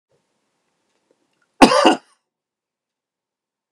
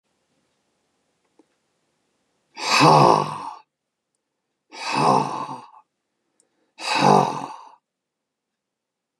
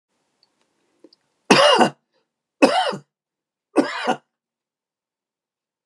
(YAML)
cough_length: 3.7 s
cough_amplitude: 32768
cough_signal_mean_std_ratio: 0.22
exhalation_length: 9.2 s
exhalation_amplitude: 31635
exhalation_signal_mean_std_ratio: 0.34
three_cough_length: 5.9 s
three_cough_amplitude: 32712
three_cough_signal_mean_std_ratio: 0.3
survey_phase: beta (2021-08-13 to 2022-03-07)
age: 65+
gender: Male
wearing_mask: 'No'
symptom_none: true
smoker_status: Never smoked
respiratory_condition_asthma: false
respiratory_condition_other: false
recruitment_source: REACT
submission_delay: 2 days
covid_test_result: Negative
covid_test_method: RT-qPCR
influenza_a_test_result: Negative
influenza_b_test_result: Negative